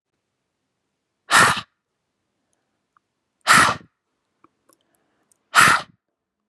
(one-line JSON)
{"exhalation_length": "6.5 s", "exhalation_amplitude": 30884, "exhalation_signal_mean_std_ratio": 0.27, "survey_phase": "beta (2021-08-13 to 2022-03-07)", "age": "18-44", "gender": "Female", "wearing_mask": "No", "symptom_cough_any": true, "symptom_runny_or_blocked_nose": true, "symptom_onset": "8 days", "smoker_status": "Never smoked", "respiratory_condition_asthma": false, "respiratory_condition_other": false, "recruitment_source": "Test and Trace", "submission_delay": "2 days", "covid_test_result": "Positive", "covid_test_method": "RT-qPCR", "covid_ct_value": 14.0, "covid_ct_gene": "ORF1ab gene"}